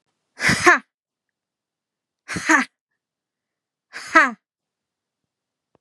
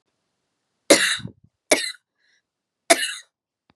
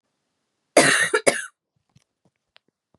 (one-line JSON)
{"exhalation_length": "5.8 s", "exhalation_amplitude": 32767, "exhalation_signal_mean_std_ratio": 0.27, "three_cough_length": "3.8 s", "three_cough_amplitude": 32767, "three_cough_signal_mean_std_ratio": 0.28, "cough_length": "3.0 s", "cough_amplitude": 32662, "cough_signal_mean_std_ratio": 0.31, "survey_phase": "beta (2021-08-13 to 2022-03-07)", "age": "18-44", "gender": "Female", "wearing_mask": "No", "symptom_cough_any": true, "symptom_new_continuous_cough": true, "symptom_fatigue": true, "symptom_onset": "3 days", "smoker_status": "Never smoked", "respiratory_condition_asthma": true, "respiratory_condition_other": false, "recruitment_source": "Test and Trace", "submission_delay": "2 days", "covid_test_result": "Positive", "covid_test_method": "RT-qPCR", "covid_ct_value": 26.7, "covid_ct_gene": "ORF1ab gene", "covid_ct_mean": 26.9, "covid_viral_load": "1500 copies/ml", "covid_viral_load_category": "Minimal viral load (< 10K copies/ml)"}